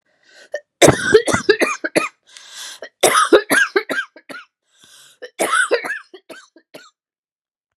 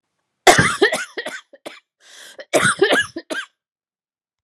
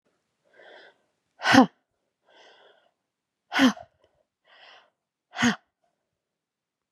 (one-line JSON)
{"three_cough_length": "7.8 s", "three_cough_amplitude": 32768, "three_cough_signal_mean_std_ratio": 0.4, "cough_length": "4.4 s", "cough_amplitude": 32768, "cough_signal_mean_std_ratio": 0.39, "exhalation_length": "6.9 s", "exhalation_amplitude": 31121, "exhalation_signal_mean_std_ratio": 0.22, "survey_phase": "beta (2021-08-13 to 2022-03-07)", "age": "45-64", "gender": "Female", "wearing_mask": "No", "symptom_cough_any": true, "symptom_runny_or_blocked_nose": true, "symptom_change_to_sense_of_smell_or_taste": true, "symptom_onset": "4 days", "smoker_status": "Never smoked", "respiratory_condition_asthma": true, "respiratory_condition_other": false, "recruitment_source": "Test and Trace", "submission_delay": "3 days", "covid_test_result": "Positive", "covid_test_method": "RT-qPCR", "covid_ct_value": 14.6, "covid_ct_gene": "ORF1ab gene", "covid_ct_mean": 15.3, "covid_viral_load": "9500000 copies/ml", "covid_viral_load_category": "High viral load (>1M copies/ml)"}